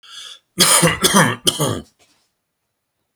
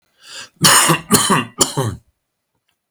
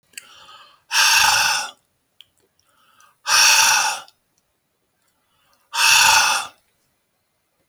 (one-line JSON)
{"three_cough_length": "3.2 s", "three_cough_amplitude": 32768, "three_cough_signal_mean_std_ratio": 0.46, "cough_length": "2.9 s", "cough_amplitude": 32768, "cough_signal_mean_std_ratio": 0.47, "exhalation_length": "7.7 s", "exhalation_amplitude": 31126, "exhalation_signal_mean_std_ratio": 0.44, "survey_phase": "alpha (2021-03-01 to 2021-08-12)", "age": "65+", "gender": "Male", "wearing_mask": "No", "symptom_none": true, "smoker_status": "Ex-smoker", "respiratory_condition_asthma": false, "respiratory_condition_other": false, "recruitment_source": "REACT", "submission_delay": "1 day", "covid_test_result": "Negative", "covid_test_method": "RT-qPCR"}